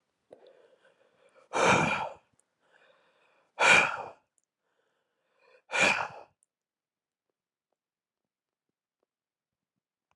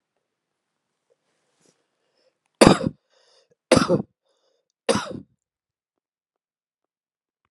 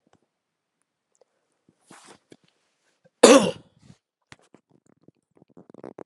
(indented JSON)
{
  "exhalation_length": "10.2 s",
  "exhalation_amplitude": 12557,
  "exhalation_signal_mean_std_ratio": 0.27,
  "three_cough_length": "7.5 s",
  "three_cough_amplitude": 32768,
  "three_cough_signal_mean_std_ratio": 0.2,
  "cough_length": "6.1 s",
  "cough_amplitude": 32768,
  "cough_signal_mean_std_ratio": 0.16,
  "survey_phase": "beta (2021-08-13 to 2022-03-07)",
  "age": "45-64",
  "gender": "Male",
  "wearing_mask": "No",
  "symptom_none": true,
  "smoker_status": "Ex-smoker",
  "respiratory_condition_asthma": false,
  "respiratory_condition_other": false,
  "recruitment_source": "REACT",
  "submission_delay": "2 days",
  "covid_test_result": "Negative",
  "covid_test_method": "RT-qPCR"
}